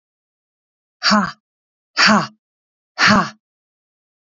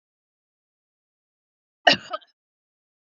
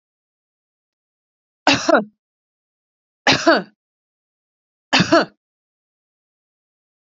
exhalation_length: 4.4 s
exhalation_amplitude: 30773
exhalation_signal_mean_std_ratio: 0.34
cough_length: 3.2 s
cough_amplitude: 28348
cough_signal_mean_std_ratio: 0.14
three_cough_length: 7.2 s
three_cough_amplitude: 29526
three_cough_signal_mean_std_ratio: 0.27
survey_phase: beta (2021-08-13 to 2022-03-07)
age: 45-64
gender: Female
wearing_mask: 'No'
symptom_none: true
smoker_status: Never smoked
respiratory_condition_asthma: false
respiratory_condition_other: false
recruitment_source: REACT
submission_delay: 3 days
covid_test_result: Negative
covid_test_method: RT-qPCR
influenza_a_test_result: Negative
influenza_b_test_result: Negative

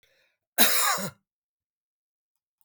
cough_length: 2.6 s
cough_amplitude: 25442
cough_signal_mean_std_ratio: 0.32
survey_phase: beta (2021-08-13 to 2022-03-07)
age: 45-64
gender: Male
wearing_mask: 'No'
symptom_none: true
smoker_status: Never smoked
respiratory_condition_asthma: false
respiratory_condition_other: false
recruitment_source: REACT
submission_delay: 2 days
covid_test_result: Negative
covid_test_method: RT-qPCR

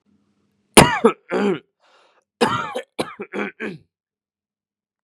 cough_length: 5.0 s
cough_amplitude: 32768
cough_signal_mean_std_ratio: 0.31
survey_phase: beta (2021-08-13 to 2022-03-07)
age: 18-44
gender: Male
wearing_mask: 'No'
symptom_none: true
symptom_onset: 8 days
smoker_status: Never smoked
respiratory_condition_asthma: false
respiratory_condition_other: false
recruitment_source: REACT
submission_delay: 0 days
covid_test_result: Negative
covid_test_method: RT-qPCR
covid_ct_value: 38.0
covid_ct_gene: N gene
influenza_a_test_result: Negative
influenza_b_test_result: Negative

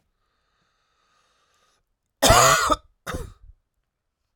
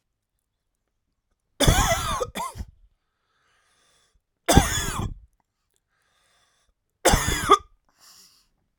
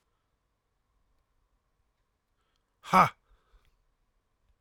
cough_length: 4.4 s
cough_amplitude: 24768
cough_signal_mean_std_ratio: 0.3
three_cough_length: 8.8 s
three_cough_amplitude: 32395
three_cough_signal_mean_std_ratio: 0.32
exhalation_length: 4.6 s
exhalation_amplitude: 14184
exhalation_signal_mean_std_ratio: 0.15
survey_phase: alpha (2021-03-01 to 2021-08-12)
age: 45-64
gender: Male
wearing_mask: 'No'
symptom_cough_any: true
symptom_fever_high_temperature: true
symptom_headache: true
smoker_status: Never smoked
respiratory_condition_asthma: false
respiratory_condition_other: false
recruitment_source: Test and Trace
submission_delay: 1 day
covid_test_result: Positive
covid_test_method: RT-qPCR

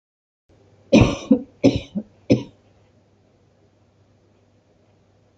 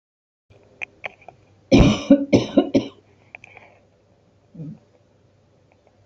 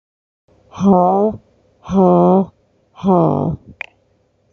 cough_length: 5.4 s
cough_amplitude: 27413
cough_signal_mean_std_ratio: 0.26
three_cough_length: 6.1 s
three_cough_amplitude: 28311
three_cough_signal_mean_std_ratio: 0.29
exhalation_length: 4.5 s
exhalation_amplitude: 29294
exhalation_signal_mean_std_ratio: 0.52
survey_phase: alpha (2021-03-01 to 2021-08-12)
age: 65+
gender: Female
wearing_mask: 'No'
symptom_none: true
smoker_status: Ex-smoker
respiratory_condition_asthma: false
respiratory_condition_other: false
recruitment_source: REACT
submission_delay: 3 days
covid_test_result: Negative
covid_test_method: RT-qPCR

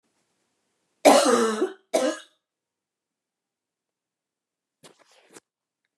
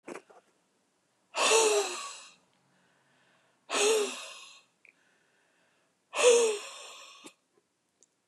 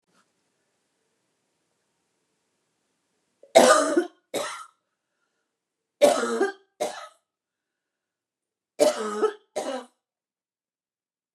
cough_length: 6.0 s
cough_amplitude: 28266
cough_signal_mean_std_ratio: 0.28
exhalation_length: 8.3 s
exhalation_amplitude: 9751
exhalation_signal_mean_std_ratio: 0.37
three_cough_length: 11.3 s
three_cough_amplitude: 26774
three_cough_signal_mean_std_ratio: 0.28
survey_phase: beta (2021-08-13 to 2022-03-07)
age: 65+
gender: Female
wearing_mask: 'No'
symptom_cough_any: true
symptom_onset: 13 days
smoker_status: Ex-smoker
respiratory_condition_asthma: false
respiratory_condition_other: false
recruitment_source: REACT
submission_delay: 2 days
covid_test_result: Negative
covid_test_method: RT-qPCR
influenza_a_test_result: Negative
influenza_b_test_result: Negative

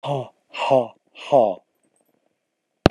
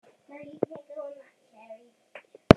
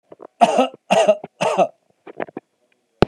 exhalation_length: 2.9 s
exhalation_amplitude: 32768
exhalation_signal_mean_std_ratio: 0.34
cough_length: 2.6 s
cough_amplitude: 32768
cough_signal_mean_std_ratio: 0.12
three_cough_length: 3.1 s
three_cough_amplitude: 32768
three_cough_signal_mean_std_ratio: 0.41
survey_phase: beta (2021-08-13 to 2022-03-07)
age: 65+
gender: Male
wearing_mask: 'No'
symptom_none: true
smoker_status: Never smoked
respiratory_condition_asthma: false
respiratory_condition_other: false
recruitment_source: REACT
submission_delay: 3 days
covid_test_result: Negative
covid_test_method: RT-qPCR
influenza_a_test_result: Negative
influenza_b_test_result: Negative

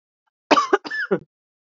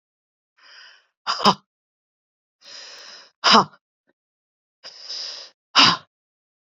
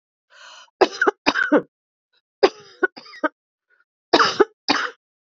cough_length: 1.8 s
cough_amplitude: 27563
cough_signal_mean_std_ratio: 0.35
exhalation_length: 6.7 s
exhalation_amplitude: 30522
exhalation_signal_mean_std_ratio: 0.26
three_cough_length: 5.3 s
three_cough_amplitude: 32767
three_cough_signal_mean_std_ratio: 0.33
survey_phase: beta (2021-08-13 to 2022-03-07)
age: 45-64
gender: Female
wearing_mask: 'No'
symptom_none: true
smoker_status: Ex-smoker
respiratory_condition_asthma: false
respiratory_condition_other: false
recruitment_source: REACT
submission_delay: 3 days
covid_test_result: Negative
covid_test_method: RT-qPCR
influenza_a_test_result: Negative
influenza_b_test_result: Negative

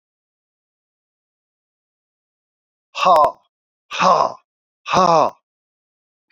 exhalation_length: 6.3 s
exhalation_amplitude: 28154
exhalation_signal_mean_std_ratio: 0.31
survey_phase: beta (2021-08-13 to 2022-03-07)
age: 45-64
gender: Male
wearing_mask: 'No'
symptom_new_continuous_cough: true
symptom_abdominal_pain: true
symptom_fatigue: true
symptom_headache: true
symptom_other: true
smoker_status: Never smoked
respiratory_condition_asthma: false
respiratory_condition_other: false
recruitment_source: Test and Trace
submission_delay: 2 days
covid_test_result: Positive
covid_test_method: RT-qPCR
covid_ct_value: 17.7
covid_ct_gene: ORF1ab gene
covid_ct_mean: 18.5
covid_viral_load: 860000 copies/ml
covid_viral_load_category: Low viral load (10K-1M copies/ml)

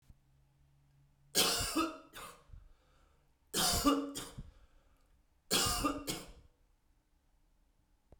three_cough_length: 8.2 s
three_cough_amplitude: 5962
three_cough_signal_mean_std_ratio: 0.41
survey_phase: beta (2021-08-13 to 2022-03-07)
age: 45-64
gender: Male
wearing_mask: 'No'
symptom_none: true
smoker_status: Ex-smoker
respiratory_condition_asthma: false
respiratory_condition_other: false
recruitment_source: REACT
submission_delay: 0 days
covid_test_result: Negative
covid_test_method: RT-qPCR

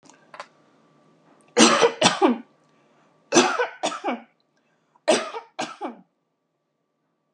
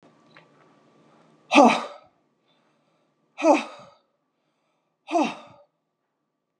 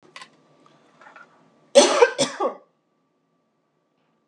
three_cough_length: 7.3 s
three_cough_amplitude: 31405
three_cough_signal_mean_std_ratio: 0.35
exhalation_length: 6.6 s
exhalation_amplitude: 29291
exhalation_signal_mean_std_ratio: 0.25
cough_length: 4.3 s
cough_amplitude: 30611
cough_signal_mean_std_ratio: 0.26
survey_phase: beta (2021-08-13 to 2022-03-07)
age: 45-64
gender: Female
wearing_mask: 'No'
symptom_none: true
symptom_onset: 8 days
smoker_status: Current smoker (11 or more cigarettes per day)
respiratory_condition_asthma: false
respiratory_condition_other: false
recruitment_source: REACT
submission_delay: 2 days
covid_test_result: Negative
covid_test_method: RT-qPCR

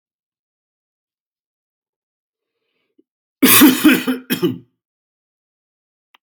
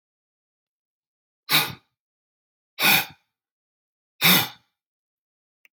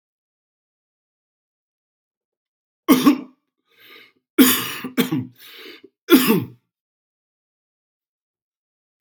cough_length: 6.2 s
cough_amplitude: 32768
cough_signal_mean_std_ratio: 0.28
exhalation_length: 5.8 s
exhalation_amplitude: 21242
exhalation_signal_mean_std_ratio: 0.26
three_cough_length: 9.0 s
three_cough_amplitude: 31916
three_cough_signal_mean_std_ratio: 0.27
survey_phase: beta (2021-08-13 to 2022-03-07)
age: 45-64
gender: Male
wearing_mask: 'No'
symptom_none: true
smoker_status: Never smoked
respiratory_condition_asthma: false
respiratory_condition_other: false
recruitment_source: REACT
submission_delay: 3 days
covid_test_result: Negative
covid_test_method: RT-qPCR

